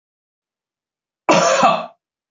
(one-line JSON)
{"cough_length": "2.3 s", "cough_amplitude": 26981, "cough_signal_mean_std_ratio": 0.4, "survey_phase": "beta (2021-08-13 to 2022-03-07)", "age": "45-64", "gender": "Male", "wearing_mask": "No", "symptom_none": true, "smoker_status": "Never smoked", "respiratory_condition_asthma": false, "respiratory_condition_other": false, "recruitment_source": "Test and Trace", "submission_delay": "1 day", "covid_test_result": "Negative", "covid_test_method": "RT-qPCR"}